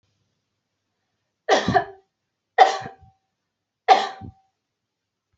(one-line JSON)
{"three_cough_length": "5.4 s", "three_cough_amplitude": 27923, "three_cough_signal_mean_std_ratio": 0.26, "survey_phase": "beta (2021-08-13 to 2022-03-07)", "age": "18-44", "gender": "Female", "wearing_mask": "No", "symptom_none": true, "symptom_onset": "12 days", "smoker_status": "Never smoked", "respiratory_condition_asthma": false, "respiratory_condition_other": false, "recruitment_source": "REACT", "submission_delay": "2 days", "covid_test_result": "Negative", "covid_test_method": "RT-qPCR", "influenza_a_test_result": "Negative", "influenza_b_test_result": "Negative"}